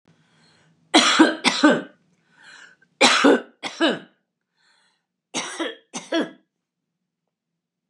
{
  "three_cough_length": "7.9 s",
  "three_cough_amplitude": 30919,
  "three_cough_signal_mean_std_ratio": 0.36,
  "survey_phase": "beta (2021-08-13 to 2022-03-07)",
  "age": "65+",
  "gender": "Female",
  "wearing_mask": "No",
  "symptom_headache": true,
  "symptom_onset": "6 days",
  "smoker_status": "Current smoker (e-cigarettes or vapes only)",
  "respiratory_condition_asthma": false,
  "respiratory_condition_other": false,
  "recruitment_source": "Test and Trace",
  "submission_delay": "3 days",
  "covid_test_result": "Negative",
  "covid_test_method": "RT-qPCR"
}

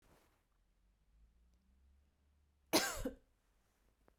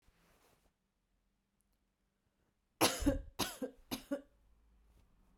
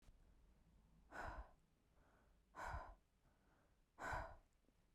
{
  "cough_length": "4.2 s",
  "cough_amplitude": 4998,
  "cough_signal_mean_std_ratio": 0.23,
  "three_cough_length": "5.4 s",
  "three_cough_amplitude": 5245,
  "three_cough_signal_mean_std_ratio": 0.28,
  "exhalation_length": "4.9 s",
  "exhalation_amplitude": 569,
  "exhalation_signal_mean_std_ratio": 0.47,
  "survey_phase": "beta (2021-08-13 to 2022-03-07)",
  "age": "18-44",
  "gender": "Female",
  "wearing_mask": "No",
  "symptom_none": true,
  "smoker_status": "Never smoked",
  "respiratory_condition_asthma": false,
  "respiratory_condition_other": false,
  "recruitment_source": "REACT",
  "submission_delay": "1 day",
  "covid_test_result": "Negative",
  "covid_test_method": "RT-qPCR",
  "influenza_a_test_result": "Negative",
  "influenza_b_test_result": "Negative"
}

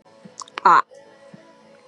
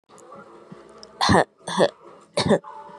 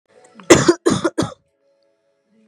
{
  "exhalation_length": "1.9 s",
  "exhalation_amplitude": 26249,
  "exhalation_signal_mean_std_ratio": 0.28,
  "three_cough_length": "3.0 s",
  "three_cough_amplitude": 26464,
  "three_cough_signal_mean_std_ratio": 0.39,
  "cough_length": "2.5 s",
  "cough_amplitude": 32768,
  "cough_signal_mean_std_ratio": 0.33,
  "survey_phase": "beta (2021-08-13 to 2022-03-07)",
  "age": "18-44",
  "gender": "Female",
  "wearing_mask": "No",
  "symptom_cough_any": true,
  "symptom_onset": "5 days",
  "smoker_status": "Current smoker (e-cigarettes or vapes only)",
  "respiratory_condition_asthma": false,
  "respiratory_condition_other": false,
  "recruitment_source": "Test and Trace",
  "submission_delay": "2 days",
  "covid_test_result": "Positive",
  "covid_test_method": "RT-qPCR",
  "covid_ct_value": 12.4,
  "covid_ct_gene": "ORF1ab gene",
  "covid_ct_mean": 12.5,
  "covid_viral_load": "80000000 copies/ml",
  "covid_viral_load_category": "High viral load (>1M copies/ml)"
}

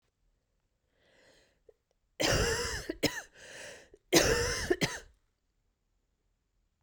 {
  "three_cough_length": "6.8 s",
  "three_cough_amplitude": 12039,
  "three_cough_signal_mean_std_ratio": 0.38,
  "survey_phase": "beta (2021-08-13 to 2022-03-07)",
  "age": "18-44",
  "gender": "Female",
  "wearing_mask": "No",
  "symptom_cough_any": true,
  "symptom_runny_or_blocked_nose": true,
  "symptom_shortness_of_breath": true,
  "symptom_diarrhoea": true,
  "symptom_fatigue": true,
  "symptom_fever_high_temperature": true,
  "symptom_headache": true,
  "symptom_change_to_sense_of_smell_or_taste": true,
  "symptom_loss_of_taste": true,
  "symptom_onset": "5 days",
  "smoker_status": "Never smoked",
  "respiratory_condition_asthma": false,
  "respiratory_condition_other": false,
  "recruitment_source": "Test and Trace",
  "submission_delay": "2 days",
  "covid_test_result": "Positive",
  "covid_test_method": "RT-qPCR",
  "covid_ct_value": 14.7,
  "covid_ct_gene": "ORF1ab gene",
  "covid_ct_mean": 15.0,
  "covid_viral_load": "12000000 copies/ml",
  "covid_viral_load_category": "High viral load (>1M copies/ml)"
}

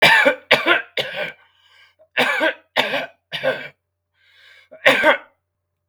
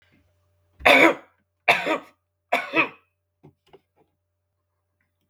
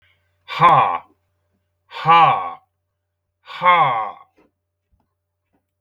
{
  "cough_length": "5.9 s",
  "cough_amplitude": 32768,
  "cough_signal_mean_std_ratio": 0.45,
  "three_cough_length": "5.3 s",
  "three_cough_amplitude": 32766,
  "three_cough_signal_mean_std_ratio": 0.29,
  "exhalation_length": "5.8 s",
  "exhalation_amplitude": 30763,
  "exhalation_signal_mean_std_ratio": 0.38,
  "survey_phase": "beta (2021-08-13 to 2022-03-07)",
  "age": "45-64",
  "gender": "Male",
  "wearing_mask": "No",
  "symptom_none": true,
  "smoker_status": "Never smoked",
  "respiratory_condition_asthma": false,
  "respiratory_condition_other": false,
  "recruitment_source": "REACT",
  "submission_delay": "1 day",
  "covid_test_result": "Negative",
  "covid_test_method": "RT-qPCR",
  "influenza_a_test_result": "Negative",
  "influenza_b_test_result": "Negative"
}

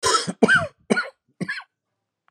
{
  "cough_length": "2.3 s",
  "cough_amplitude": 26366,
  "cough_signal_mean_std_ratio": 0.43,
  "survey_phase": "beta (2021-08-13 to 2022-03-07)",
  "age": "45-64",
  "gender": "Male",
  "wearing_mask": "No",
  "symptom_cough_any": true,
  "symptom_headache": true,
  "symptom_onset": "4 days",
  "smoker_status": "Never smoked",
  "respiratory_condition_asthma": false,
  "respiratory_condition_other": false,
  "recruitment_source": "Test and Trace",
  "submission_delay": "1 day",
  "covid_test_result": "Positive",
  "covid_test_method": "RT-qPCR",
  "covid_ct_value": 18.3,
  "covid_ct_gene": "N gene"
}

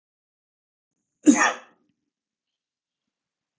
{
  "cough_length": "3.6 s",
  "cough_amplitude": 22471,
  "cough_signal_mean_std_ratio": 0.2,
  "survey_phase": "beta (2021-08-13 to 2022-03-07)",
  "age": "45-64",
  "gender": "Male",
  "wearing_mask": "No",
  "symptom_none": true,
  "smoker_status": "Never smoked",
  "respiratory_condition_asthma": false,
  "respiratory_condition_other": false,
  "recruitment_source": "REACT",
  "submission_delay": "1 day",
  "covid_test_result": "Negative",
  "covid_test_method": "RT-qPCR"
}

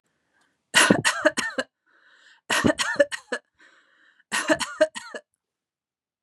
{
  "three_cough_length": "6.2 s",
  "three_cough_amplitude": 29626,
  "three_cough_signal_mean_std_ratio": 0.37,
  "survey_phase": "beta (2021-08-13 to 2022-03-07)",
  "age": "45-64",
  "gender": "Female",
  "wearing_mask": "No",
  "symptom_none": true,
  "smoker_status": "Never smoked",
  "respiratory_condition_asthma": false,
  "respiratory_condition_other": false,
  "recruitment_source": "REACT",
  "submission_delay": "2 days",
  "covid_test_result": "Negative",
  "covid_test_method": "RT-qPCR",
  "influenza_a_test_result": "Unknown/Void",
  "influenza_b_test_result": "Unknown/Void"
}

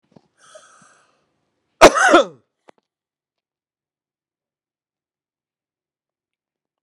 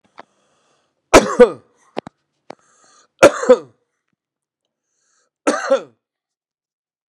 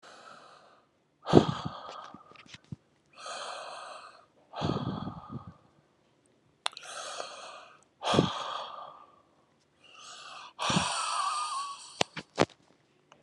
{
  "cough_length": "6.8 s",
  "cough_amplitude": 32768,
  "cough_signal_mean_std_ratio": 0.18,
  "three_cough_length": "7.1 s",
  "three_cough_amplitude": 32768,
  "three_cough_signal_mean_std_ratio": 0.23,
  "exhalation_length": "13.2 s",
  "exhalation_amplitude": 29291,
  "exhalation_signal_mean_std_ratio": 0.38,
  "survey_phase": "beta (2021-08-13 to 2022-03-07)",
  "age": "45-64",
  "gender": "Male",
  "wearing_mask": "No",
  "symptom_none": true,
  "smoker_status": "Ex-smoker",
  "respiratory_condition_asthma": false,
  "respiratory_condition_other": false,
  "recruitment_source": "REACT",
  "submission_delay": "1 day",
  "covid_test_result": "Negative",
  "covid_test_method": "RT-qPCR",
  "influenza_a_test_result": "Negative",
  "influenza_b_test_result": "Negative"
}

